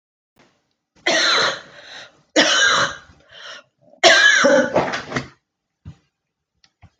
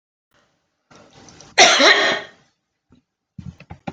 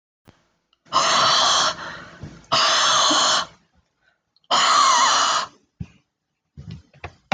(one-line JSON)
{"three_cough_length": "7.0 s", "three_cough_amplitude": 30745, "three_cough_signal_mean_std_ratio": 0.46, "cough_length": "3.9 s", "cough_amplitude": 29524, "cough_signal_mean_std_ratio": 0.33, "exhalation_length": "7.3 s", "exhalation_amplitude": 19606, "exhalation_signal_mean_std_ratio": 0.58, "survey_phase": "alpha (2021-03-01 to 2021-08-12)", "age": "65+", "gender": "Female", "wearing_mask": "No", "symptom_none": true, "smoker_status": "Never smoked", "respiratory_condition_asthma": false, "respiratory_condition_other": false, "recruitment_source": "REACT", "submission_delay": "1 day", "covid_test_result": "Negative", "covid_test_method": "RT-qPCR"}